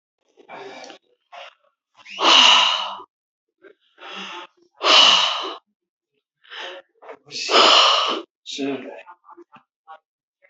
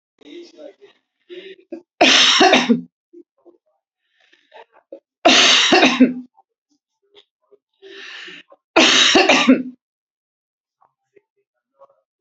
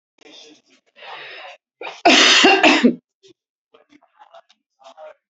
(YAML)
exhalation_length: 10.5 s
exhalation_amplitude: 31022
exhalation_signal_mean_std_ratio: 0.4
three_cough_length: 12.2 s
three_cough_amplitude: 32768
three_cough_signal_mean_std_ratio: 0.39
cough_length: 5.3 s
cough_amplitude: 32768
cough_signal_mean_std_ratio: 0.36
survey_phase: beta (2021-08-13 to 2022-03-07)
age: 65+
gender: Female
wearing_mask: 'No'
symptom_none: true
smoker_status: Never smoked
respiratory_condition_asthma: false
respiratory_condition_other: false
recruitment_source: REACT
submission_delay: 0 days
covid_test_result: Negative
covid_test_method: RT-qPCR
influenza_a_test_result: Negative
influenza_b_test_result: Negative